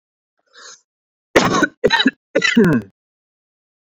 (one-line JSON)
{"three_cough_length": "3.9 s", "three_cough_amplitude": 28068, "three_cough_signal_mean_std_ratio": 0.4, "survey_phase": "beta (2021-08-13 to 2022-03-07)", "age": "18-44", "gender": "Male", "wearing_mask": "No", "symptom_none": true, "symptom_onset": "4 days", "smoker_status": "Never smoked", "respiratory_condition_asthma": false, "respiratory_condition_other": false, "recruitment_source": "REACT", "submission_delay": "1 day", "covid_test_result": "Negative", "covid_test_method": "RT-qPCR"}